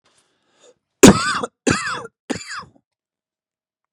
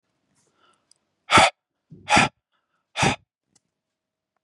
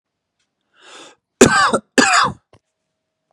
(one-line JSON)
{"three_cough_length": "3.9 s", "three_cough_amplitude": 32768, "three_cough_signal_mean_std_ratio": 0.26, "exhalation_length": "4.4 s", "exhalation_amplitude": 27580, "exhalation_signal_mean_std_ratio": 0.27, "cough_length": "3.3 s", "cough_amplitude": 32768, "cough_signal_mean_std_ratio": 0.36, "survey_phase": "beta (2021-08-13 to 2022-03-07)", "age": "18-44", "gender": "Male", "wearing_mask": "No", "symptom_none": true, "smoker_status": "Never smoked", "respiratory_condition_asthma": false, "respiratory_condition_other": false, "recruitment_source": "REACT", "submission_delay": "2 days", "covid_test_result": "Negative", "covid_test_method": "RT-qPCR", "influenza_a_test_result": "Negative", "influenza_b_test_result": "Negative"}